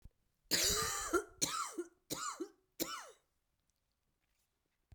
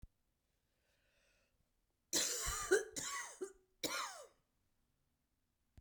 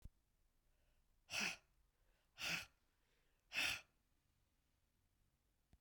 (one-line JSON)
{"cough_length": "4.9 s", "cough_amplitude": 5966, "cough_signal_mean_std_ratio": 0.44, "three_cough_length": "5.8 s", "three_cough_amplitude": 3339, "three_cough_signal_mean_std_ratio": 0.37, "exhalation_length": "5.8 s", "exhalation_amplitude": 1295, "exhalation_signal_mean_std_ratio": 0.31, "survey_phase": "beta (2021-08-13 to 2022-03-07)", "age": "45-64", "gender": "Female", "wearing_mask": "No", "symptom_cough_any": true, "symptom_runny_or_blocked_nose": true, "symptom_shortness_of_breath": true, "symptom_fatigue": true, "symptom_headache": true, "symptom_change_to_sense_of_smell_or_taste": true, "symptom_onset": "2 days", "smoker_status": "Ex-smoker", "respiratory_condition_asthma": false, "respiratory_condition_other": false, "recruitment_source": "Test and Trace", "submission_delay": "1 day", "covid_test_method": "RT-qPCR", "covid_ct_value": 29.1, "covid_ct_gene": "ORF1ab gene"}